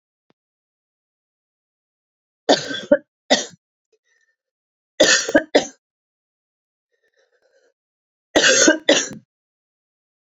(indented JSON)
{
  "three_cough_length": "10.2 s",
  "three_cough_amplitude": 29187,
  "three_cough_signal_mean_std_ratio": 0.28,
  "survey_phase": "beta (2021-08-13 to 2022-03-07)",
  "age": "45-64",
  "gender": "Female",
  "wearing_mask": "No",
  "symptom_cough_any": true,
  "symptom_sore_throat": true,
  "symptom_fatigue": true,
  "symptom_fever_high_temperature": true,
  "symptom_headache": true,
  "symptom_onset": "3 days",
  "smoker_status": "Never smoked",
  "respiratory_condition_asthma": false,
  "respiratory_condition_other": false,
  "recruitment_source": "Test and Trace",
  "submission_delay": "2 days",
  "covid_test_result": "Positive",
  "covid_test_method": "RT-qPCR",
  "covid_ct_value": 31.0,
  "covid_ct_gene": "N gene"
}